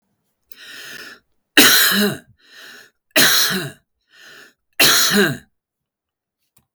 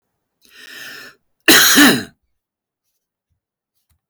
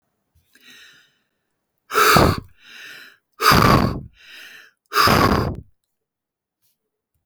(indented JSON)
{
  "three_cough_length": "6.7 s",
  "three_cough_amplitude": 32768,
  "three_cough_signal_mean_std_ratio": 0.42,
  "cough_length": "4.1 s",
  "cough_amplitude": 32768,
  "cough_signal_mean_std_ratio": 0.32,
  "exhalation_length": "7.3 s",
  "exhalation_amplitude": 32768,
  "exhalation_signal_mean_std_ratio": 0.38,
  "survey_phase": "beta (2021-08-13 to 2022-03-07)",
  "age": "65+",
  "gender": "Male",
  "wearing_mask": "No",
  "symptom_none": true,
  "smoker_status": "Never smoked",
  "respiratory_condition_asthma": false,
  "respiratory_condition_other": false,
  "recruitment_source": "REACT",
  "submission_delay": "1 day",
  "covid_test_result": "Negative",
  "covid_test_method": "RT-qPCR"
}